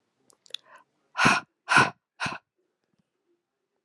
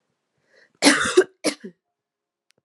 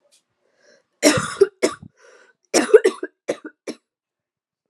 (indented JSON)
{
  "exhalation_length": "3.8 s",
  "exhalation_amplitude": 20518,
  "exhalation_signal_mean_std_ratio": 0.28,
  "cough_length": "2.6 s",
  "cough_amplitude": 31380,
  "cough_signal_mean_std_ratio": 0.3,
  "three_cough_length": "4.7 s",
  "three_cough_amplitude": 32614,
  "three_cough_signal_mean_std_ratio": 0.28,
  "survey_phase": "beta (2021-08-13 to 2022-03-07)",
  "age": "18-44",
  "gender": "Female",
  "wearing_mask": "No",
  "symptom_cough_any": true,
  "symptom_runny_or_blocked_nose": true,
  "symptom_sore_throat": true,
  "symptom_headache": true,
  "symptom_onset": "2 days",
  "smoker_status": "Never smoked",
  "respiratory_condition_asthma": false,
  "respiratory_condition_other": false,
  "recruitment_source": "Test and Trace",
  "submission_delay": "1 day",
  "covid_test_result": "Positive",
  "covid_test_method": "RT-qPCR",
  "covid_ct_value": 18.6,
  "covid_ct_gene": "N gene"
}